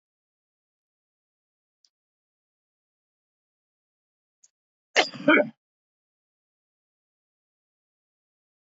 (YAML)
cough_length: 8.6 s
cough_amplitude: 16019
cough_signal_mean_std_ratio: 0.14
survey_phase: alpha (2021-03-01 to 2021-08-12)
age: 65+
gender: Male
wearing_mask: 'No'
symptom_cough_any: true
symptom_onset: 3 days
smoker_status: Never smoked
respiratory_condition_asthma: false
respiratory_condition_other: false
recruitment_source: Test and Trace
submission_delay: 2 days
covid_test_result: Positive
covid_test_method: RT-qPCR
covid_ct_value: 14.8
covid_ct_gene: ORF1ab gene
covid_ct_mean: 15.2
covid_viral_load: 10000000 copies/ml
covid_viral_load_category: High viral load (>1M copies/ml)